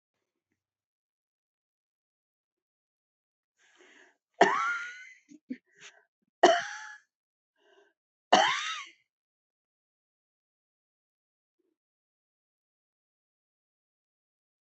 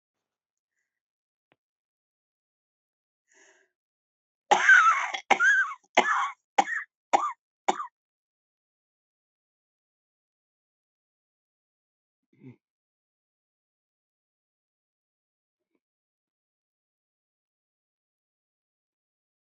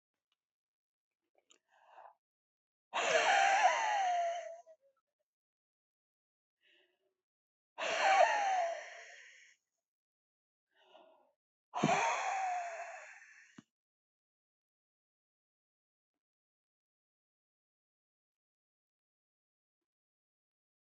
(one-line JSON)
{"three_cough_length": "14.7 s", "three_cough_amplitude": 18123, "three_cough_signal_mean_std_ratio": 0.2, "cough_length": "19.5 s", "cough_amplitude": 21772, "cough_signal_mean_std_ratio": 0.22, "exhalation_length": "20.9 s", "exhalation_amplitude": 5215, "exhalation_signal_mean_std_ratio": 0.34, "survey_phase": "beta (2021-08-13 to 2022-03-07)", "age": "65+", "gender": "Female", "wearing_mask": "No", "symptom_cough_any": true, "symptom_runny_or_blocked_nose": true, "symptom_shortness_of_breath": true, "symptom_abdominal_pain": true, "symptom_fatigue": true, "symptom_change_to_sense_of_smell_or_taste": true, "symptom_loss_of_taste": true, "smoker_status": "Ex-smoker", "respiratory_condition_asthma": false, "respiratory_condition_other": true, "recruitment_source": "REACT", "submission_delay": "1 day", "covid_test_result": "Negative", "covid_test_method": "RT-qPCR"}